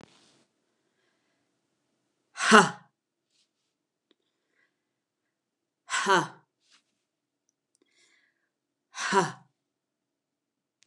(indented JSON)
{
  "exhalation_length": "10.9 s",
  "exhalation_amplitude": 29203,
  "exhalation_signal_mean_std_ratio": 0.19,
  "survey_phase": "alpha (2021-03-01 to 2021-08-12)",
  "age": "65+",
  "gender": "Female",
  "wearing_mask": "No",
  "symptom_none": true,
  "smoker_status": "Ex-smoker",
  "respiratory_condition_asthma": false,
  "respiratory_condition_other": false,
  "recruitment_source": "REACT",
  "submission_delay": "6 days",
  "covid_test_result": "Negative",
  "covid_test_method": "RT-qPCR"
}